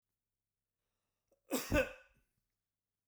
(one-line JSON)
{"cough_length": "3.1 s", "cough_amplitude": 3266, "cough_signal_mean_std_ratio": 0.25, "survey_phase": "beta (2021-08-13 to 2022-03-07)", "age": "65+", "gender": "Male", "wearing_mask": "No", "symptom_none": true, "smoker_status": "Never smoked", "respiratory_condition_asthma": false, "respiratory_condition_other": false, "recruitment_source": "REACT", "submission_delay": "2 days", "covid_test_result": "Negative", "covid_test_method": "RT-qPCR"}